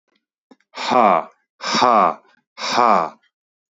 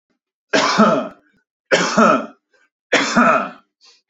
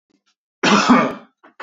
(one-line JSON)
{"exhalation_length": "3.8 s", "exhalation_amplitude": 29864, "exhalation_signal_mean_std_ratio": 0.46, "three_cough_length": "4.1 s", "three_cough_amplitude": 27956, "three_cough_signal_mean_std_ratio": 0.52, "cough_length": "1.6 s", "cough_amplitude": 27500, "cough_signal_mean_std_ratio": 0.46, "survey_phase": "beta (2021-08-13 to 2022-03-07)", "age": "18-44", "gender": "Male", "wearing_mask": "No", "symptom_none": true, "smoker_status": "Ex-smoker", "respiratory_condition_asthma": false, "respiratory_condition_other": false, "recruitment_source": "REACT", "submission_delay": "2 days", "covid_test_result": "Negative", "covid_test_method": "RT-qPCR"}